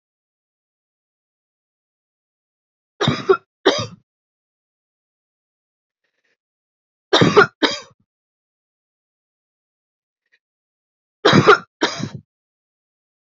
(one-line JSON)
{"three_cough_length": "13.4 s", "three_cough_amplitude": 29551, "three_cough_signal_mean_std_ratio": 0.23, "survey_phase": "beta (2021-08-13 to 2022-03-07)", "age": "18-44", "gender": "Female", "wearing_mask": "No", "symptom_cough_any": true, "symptom_runny_or_blocked_nose": true, "symptom_fatigue": true, "symptom_onset": "2 days", "smoker_status": "Never smoked", "respiratory_condition_asthma": false, "respiratory_condition_other": false, "recruitment_source": "Test and Trace", "submission_delay": "2 days", "covid_test_result": "Positive", "covid_test_method": "RT-qPCR", "covid_ct_value": 18.2, "covid_ct_gene": "ORF1ab gene", "covid_ct_mean": 19.4, "covid_viral_load": "440000 copies/ml", "covid_viral_load_category": "Low viral load (10K-1M copies/ml)"}